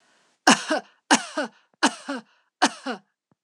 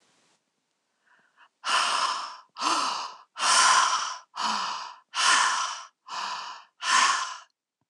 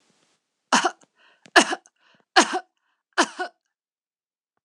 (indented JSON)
{
  "three_cough_length": "3.4 s",
  "three_cough_amplitude": 26027,
  "three_cough_signal_mean_std_ratio": 0.34,
  "exhalation_length": "7.9 s",
  "exhalation_amplitude": 14166,
  "exhalation_signal_mean_std_ratio": 0.57,
  "cough_length": "4.6 s",
  "cough_amplitude": 26027,
  "cough_signal_mean_std_ratio": 0.26,
  "survey_phase": "alpha (2021-03-01 to 2021-08-12)",
  "age": "45-64",
  "gender": "Female",
  "wearing_mask": "No",
  "symptom_none": true,
  "smoker_status": "Never smoked",
  "respiratory_condition_asthma": false,
  "respiratory_condition_other": false,
  "recruitment_source": "REACT",
  "submission_delay": "1 day",
  "covid_test_result": "Negative",
  "covid_test_method": "RT-qPCR"
}